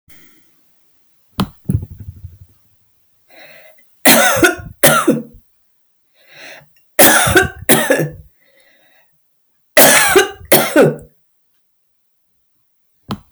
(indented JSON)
{
  "three_cough_length": "13.3 s",
  "three_cough_amplitude": 32768,
  "three_cough_signal_mean_std_ratio": 0.39,
  "survey_phase": "alpha (2021-03-01 to 2021-08-12)",
  "age": "65+",
  "gender": "Female",
  "wearing_mask": "No",
  "symptom_none": true,
  "smoker_status": "Never smoked",
  "respiratory_condition_asthma": false,
  "respiratory_condition_other": false,
  "recruitment_source": "REACT",
  "submission_delay": "2 days",
  "covid_test_result": "Negative",
  "covid_test_method": "RT-qPCR"
}